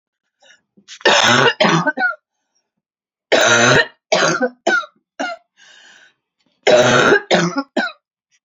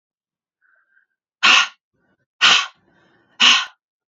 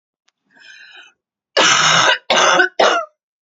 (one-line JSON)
{"three_cough_length": "8.4 s", "three_cough_amplitude": 32176, "three_cough_signal_mean_std_ratio": 0.51, "exhalation_length": "4.1 s", "exhalation_amplitude": 32104, "exhalation_signal_mean_std_ratio": 0.33, "cough_length": "3.4 s", "cough_amplitude": 32141, "cough_signal_mean_std_ratio": 0.53, "survey_phase": "beta (2021-08-13 to 2022-03-07)", "age": "18-44", "gender": "Female", "wearing_mask": "No", "symptom_cough_any": true, "symptom_new_continuous_cough": true, "symptom_runny_or_blocked_nose": true, "symptom_shortness_of_breath": true, "symptom_sore_throat": true, "symptom_abdominal_pain": true, "symptom_fatigue": true, "symptom_headache": true, "symptom_other": true, "symptom_onset": "2 days", "smoker_status": "Never smoked", "respiratory_condition_asthma": true, "respiratory_condition_other": false, "recruitment_source": "Test and Trace", "submission_delay": "2 days", "covid_test_result": "Positive", "covid_test_method": "RT-qPCR", "covid_ct_value": 27.1, "covid_ct_gene": "S gene", "covid_ct_mean": 27.4, "covid_viral_load": "1100 copies/ml", "covid_viral_load_category": "Minimal viral load (< 10K copies/ml)"}